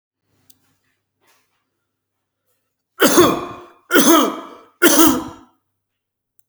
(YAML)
three_cough_length: 6.5 s
three_cough_amplitude: 32768
three_cough_signal_mean_std_ratio: 0.35
survey_phase: beta (2021-08-13 to 2022-03-07)
age: 45-64
gender: Male
wearing_mask: 'No'
symptom_none: true
smoker_status: Ex-smoker
respiratory_condition_asthma: false
respiratory_condition_other: false
recruitment_source: REACT
submission_delay: 0 days
covid_test_result: Negative
covid_test_method: RT-qPCR